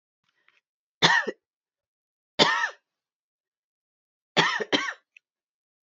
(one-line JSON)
{"three_cough_length": "6.0 s", "three_cough_amplitude": 22229, "three_cough_signal_mean_std_ratio": 0.3, "survey_phase": "beta (2021-08-13 to 2022-03-07)", "age": "18-44", "gender": "Female", "wearing_mask": "No", "symptom_cough_any": true, "symptom_runny_or_blocked_nose": true, "symptom_fatigue": true, "symptom_headache": true, "symptom_onset": "5 days", "smoker_status": "Never smoked", "respiratory_condition_asthma": false, "respiratory_condition_other": false, "recruitment_source": "REACT", "submission_delay": "3 days", "covid_test_result": "Negative", "covid_test_method": "RT-qPCR", "influenza_a_test_result": "Unknown/Void", "influenza_b_test_result": "Unknown/Void"}